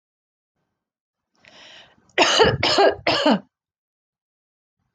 cough_length: 4.9 s
cough_amplitude: 25849
cough_signal_mean_std_ratio: 0.37
survey_phase: beta (2021-08-13 to 2022-03-07)
age: 45-64
gender: Female
wearing_mask: 'No'
symptom_sore_throat: true
smoker_status: Never smoked
respiratory_condition_asthma: false
respiratory_condition_other: false
recruitment_source: REACT
submission_delay: 3 days
covid_test_result: Negative
covid_test_method: RT-qPCR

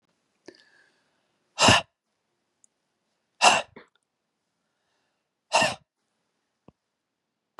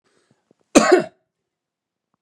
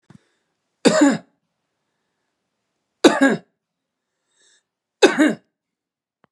exhalation_length: 7.6 s
exhalation_amplitude: 22117
exhalation_signal_mean_std_ratio: 0.22
cough_length: 2.2 s
cough_amplitude: 32767
cough_signal_mean_std_ratio: 0.26
three_cough_length: 6.3 s
three_cough_amplitude: 32768
three_cough_signal_mean_std_ratio: 0.28
survey_phase: beta (2021-08-13 to 2022-03-07)
age: 45-64
gender: Male
wearing_mask: 'No'
symptom_runny_or_blocked_nose: true
symptom_onset: 4 days
smoker_status: Never smoked
respiratory_condition_asthma: false
respiratory_condition_other: false
recruitment_source: Test and Trace
submission_delay: 1 day
covid_test_result: Positive
covid_test_method: RT-qPCR
covid_ct_value: 16.9
covid_ct_gene: ORF1ab gene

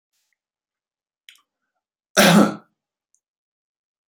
cough_length: 4.1 s
cough_amplitude: 30916
cough_signal_mean_std_ratio: 0.23
survey_phase: beta (2021-08-13 to 2022-03-07)
age: 65+
gender: Male
wearing_mask: 'No'
symptom_none: true
smoker_status: Ex-smoker
respiratory_condition_asthma: false
respiratory_condition_other: false
recruitment_source: REACT
submission_delay: 1 day
covid_test_result: Negative
covid_test_method: RT-qPCR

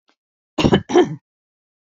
cough_length: 1.9 s
cough_amplitude: 26761
cough_signal_mean_std_ratio: 0.36
survey_phase: beta (2021-08-13 to 2022-03-07)
age: 65+
gender: Female
wearing_mask: 'No'
symptom_cough_any: true
symptom_sore_throat: true
symptom_fever_high_temperature: true
symptom_headache: true
symptom_onset: 5 days
smoker_status: Never smoked
respiratory_condition_asthma: false
respiratory_condition_other: false
recruitment_source: Test and Trace
submission_delay: 2 days
covid_test_result: Positive
covid_test_method: RT-qPCR
covid_ct_value: 30.7
covid_ct_gene: ORF1ab gene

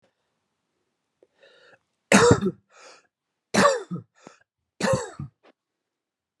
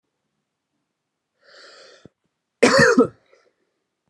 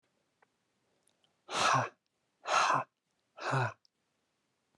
three_cough_length: 6.4 s
three_cough_amplitude: 29954
three_cough_signal_mean_std_ratio: 0.29
cough_length: 4.1 s
cough_amplitude: 29800
cough_signal_mean_std_ratio: 0.27
exhalation_length: 4.8 s
exhalation_amplitude: 6160
exhalation_signal_mean_std_ratio: 0.38
survey_phase: alpha (2021-03-01 to 2021-08-12)
age: 18-44
gender: Male
wearing_mask: 'No'
symptom_fatigue: true
smoker_status: Never smoked
respiratory_condition_asthma: true
respiratory_condition_other: false
recruitment_source: REACT
submission_delay: 1 day
covid_test_result: Negative
covid_test_method: RT-qPCR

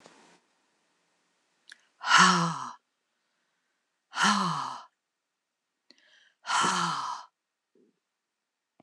exhalation_length: 8.8 s
exhalation_amplitude: 17424
exhalation_signal_mean_std_ratio: 0.34
survey_phase: alpha (2021-03-01 to 2021-08-12)
age: 65+
gender: Female
wearing_mask: 'No'
symptom_none: true
smoker_status: Never smoked
respiratory_condition_asthma: false
respiratory_condition_other: false
recruitment_source: REACT
submission_delay: 2 days
covid_test_result: Negative
covid_test_method: RT-qPCR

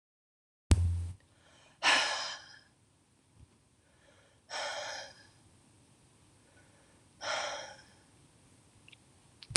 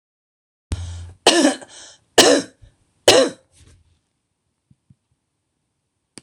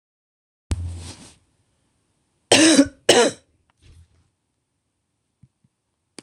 exhalation_length: 9.6 s
exhalation_amplitude: 24920
exhalation_signal_mean_std_ratio: 0.33
three_cough_length: 6.2 s
three_cough_amplitude: 26028
three_cough_signal_mean_std_ratio: 0.3
cough_length: 6.2 s
cough_amplitude: 26028
cough_signal_mean_std_ratio: 0.27
survey_phase: alpha (2021-03-01 to 2021-08-12)
age: 45-64
gender: Female
wearing_mask: 'No'
symptom_cough_any: true
symptom_shortness_of_breath: true
symptom_abdominal_pain: true
symptom_fatigue: true
symptom_fever_high_temperature: true
symptom_headache: true
symptom_change_to_sense_of_smell_or_taste: true
symptom_loss_of_taste: true
symptom_onset: 5 days
smoker_status: Ex-smoker
respiratory_condition_asthma: false
respiratory_condition_other: false
recruitment_source: Test and Trace
submission_delay: 1 day
covid_test_result: Positive
covid_test_method: RT-qPCR
covid_ct_value: 20.0
covid_ct_gene: N gene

